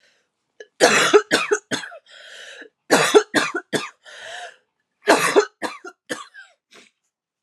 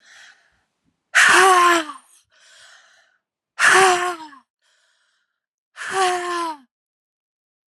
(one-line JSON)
{"three_cough_length": "7.4 s", "three_cough_amplitude": 32767, "three_cough_signal_mean_std_ratio": 0.39, "exhalation_length": "7.7 s", "exhalation_amplitude": 31455, "exhalation_signal_mean_std_ratio": 0.4, "survey_phase": "alpha (2021-03-01 to 2021-08-12)", "age": "18-44", "gender": "Female", "wearing_mask": "No", "symptom_headache": true, "symptom_change_to_sense_of_smell_or_taste": true, "symptom_onset": "5 days", "smoker_status": "Ex-smoker", "respiratory_condition_asthma": false, "respiratory_condition_other": false, "recruitment_source": "Test and Trace", "submission_delay": "1 day", "covid_test_result": "Positive", "covid_test_method": "RT-qPCR", "covid_ct_value": 21.4, "covid_ct_gene": "ORF1ab gene", "covid_ct_mean": 21.5, "covid_viral_load": "90000 copies/ml", "covid_viral_load_category": "Low viral load (10K-1M copies/ml)"}